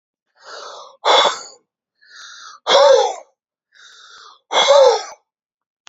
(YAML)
exhalation_length: 5.9 s
exhalation_amplitude: 29435
exhalation_signal_mean_std_ratio: 0.41
survey_phase: beta (2021-08-13 to 2022-03-07)
age: 45-64
gender: Male
wearing_mask: 'No'
symptom_none: true
smoker_status: Never smoked
respiratory_condition_asthma: false
respiratory_condition_other: false
recruitment_source: REACT
submission_delay: 3 days
covid_test_result: Negative
covid_test_method: RT-qPCR
influenza_a_test_result: Unknown/Void
influenza_b_test_result: Unknown/Void